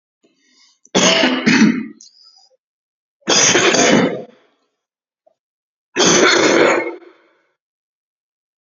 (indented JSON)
{
  "three_cough_length": "8.6 s",
  "three_cough_amplitude": 32768,
  "three_cough_signal_mean_std_ratio": 0.48,
  "survey_phase": "beta (2021-08-13 to 2022-03-07)",
  "age": "18-44",
  "gender": "Male",
  "wearing_mask": "No",
  "symptom_none": true,
  "smoker_status": "Never smoked",
  "respiratory_condition_asthma": false,
  "respiratory_condition_other": false,
  "recruitment_source": "REACT",
  "submission_delay": "3 days",
  "covid_test_result": "Negative",
  "covid_test_method": "RT-qPCR",
  "influenza_a_test_result": "Negative",
  "influenza_b_test_result": "Negative"
}